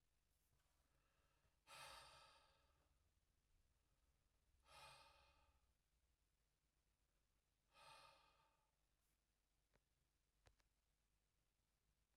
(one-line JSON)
{"exhalation_length": "12.2 s", "exhalation_amplitude": 110, "exhalation_signal_mean_std_ratio": 0.48, "survey_phase": "beta (2021-08-13 to 2022-03-07)", "age": "45-64", "gender": "Male", "wearing_mask": "No", "symptom_none": true, "smoker_status": "Never smoked", "respiratory_condition_asthma": false, "respiratory_condition_other": false, "recruitment_source": "REACT", "submission_delay": "0 days", "covid_test_result": "Negative", "covid_test_method": "RT-qPCR"}